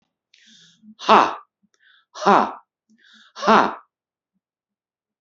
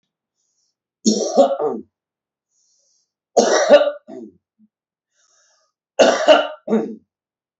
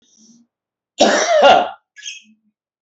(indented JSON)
{
  "exhalation_length": "5.2 s",
  "exhalation_amplitude": 31861,
  "exhalation_signal_mean_std_ratio": 0.28,
  "three_cough_length": "7.6 s",
  "three_cough_amplitude": 28843,
  "three_cough_signal_mean_std_ratio": 0.37,
  "cough_length": "2.8 s",
  "cough_amplitude": 29969,
  "cough_signal_mean_std_ratio": 0.42,
  "survey_phase": "beta (2021-08-13 to 2022-03-07)",
  "age": "45-64",
  "gender": "Male",
  "wearing_mask": "No",
  "symptom_none": true,
  "smoker_status": "Ex-smoker",
  "respiratory_condition_asthma": false,
  "respiratory_condition_other": false,
  "recruitment_source": "REACT",
  "submission_delay": "5 days",
  "covid_test_result": "Negative",
  "covid_test_method": "RT-qPCR",
  "influenza_a_test_result": "Negative",
  "influenza_b_test_result": "Negative"
}